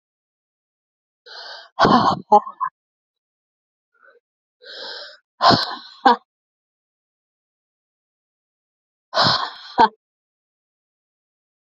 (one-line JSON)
{"exhalation_length": "11.6 s", "exhalation_amplitude": 29615, "exhalation_signal_mean_std_ratio": 0.27, "survey_phase": "alpha (2021-03-01 to 2021-08-12)", "age": "45-64", "gender": "Female", "wearing_mask": "No", "symptom_cough_any": true, "symptom_shortness_of_breath": true, "symptom_fatigue": true, "symptom_fever_high_temperature": true, "symptom_headache": true, "symptom_onset": "5 days", "smoker_status": "Current smoker (e-cigarettes or vapes only)", "respiratory_condition_asthma": false, "respiratory_condition_other": false, "recruitment_source": "Test and Trace", "submission_delay": "2 days", "covid_test_result": "Positive", "covid_test_method": "RT-qPCR", "covid_ct_value": 17.4, "covid_ct_gene": "ORF1ab gene", "covid_ct_mean": 18.1, "covid_viral_load": "1200000 copies/ml", "covid_viral_load_category": "High viral load (>1M copies/ml)"}